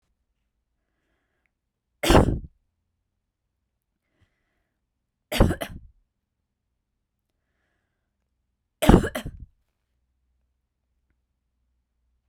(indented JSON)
{
  "three_cough_length": "12.3 s",
  "three_cough_amplitude": 32768,
  "three_cough_signal_mean_std_ratio": 0.19,
  "survey_phase": "beta (2021-08-13 to 2022-03-07)",
  "age": "18-44",
  "gender": "Female",
  "wearing_mask": "No",
  "symptom_cough_any": true,
  "symptom_runny_or_blocked_nose": true,
  "symptom_sore_throat": true,
  "symptom_fatigue": true,
  "symptom_fever_high_temperature": true,
  "symptom_headache": true,
  "symptom_change_to_sense_of_smell_or_taste": true,
  "symptom_other": true,
  "smoker_status": "Never smoked",
  "respiratory_condition_asthma": true,
  "respiratory_condition_other": false,
  "recruitment_source": "Test and Trace",
  "submission_delay": "1 day",
  "covid_test_result": "Positive",
  "covid_test_method": "ePCR"
}